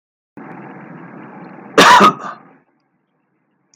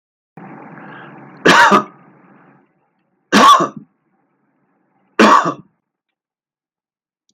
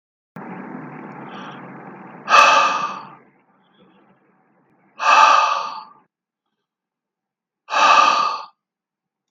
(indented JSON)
{
  "cough_length": "3.8 s",
  "cough_amplitude": 32768,
  "cough_signal_mean_std_ratio": 0.32,
  "three_cough_length": "7.3 s",
  "three_cough_amplitude": 32768,
  "three_cough_signal_mean_std_ratio": 0.33,
  "exhalation_length": "9.3 s",
  "exhalation_amplitude": 32768,
  "exhalation_signal_mean_std_ratio": 0.4,
  "survey_phase": "beta (2021-08-13 to 2022-03-07)",
  "age": "65+",
  "gender": "Male",
  "wearing_mask": "No",
  "symptom_none": true,
  "smoker_status": "Never smoked",
  "respiratory_condition_asthma": false,
  "respiratory_condition_other": false,
  "recruitment_source": "REACT",
  "submission_delay": "1 day",
  "covid_test_result": "Negative",
  "covid_test_method": "RT-qPCR"
}